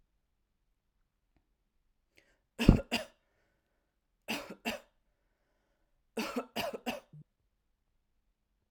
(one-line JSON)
{"three_cough_length": "8.7 s", "three_cough_amplitude": 21660, "three_cough_signal_mean_std_ratio": 0.2, "survey_phase": "alpha (2021-03-01 to 2021-08-12)", "age": "18-44", "gender": "Female", "wearing_mask": "No", "symptom_none": true, "smoker_status": "Never smoked", "respiratory_condition_asthma": false, "respiratory_condition_other": false, "recruitment_source": "REACT", "submission_delay": "3 days", "covid_test_result": "Negative", "covid_test_method": "RT-qPCR"}